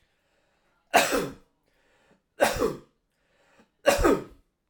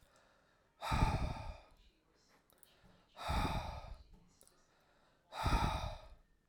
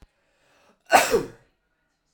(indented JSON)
{
  "three_cough_length": "4.7 s",
  "three_cough_amplitude": 19272,
  "three_cough_signal_mean_std_ratio": 0.35,
  "exhalation_length": "6.5 s",
  "exhalation_amplitude": 3555,
  "exhalation_signal_mean_std_ratio": 0.45,
  "cough_length": "2.1 s",
  "cough_amplitude": 26643,
  "cough_signal_mean_std_ratio": 0.28,
  "survey_phase": "alpha (2021-03-01 to 2021-08-12)",
  "age": "18-44",
  "gender": "Male",
  "wearing_mask": "No",
  "symptom_none": true,
  "smoker_status": "Never smoked",
  "respiratory_condition_asthma": false,
  "respiratory_condition_other": false,
  "recruitment_source": "REACT",
  "submission_delay": "1 day",
  "covid_test_result": "Negative",
  "covid_test_method": "RT-qPCR"
}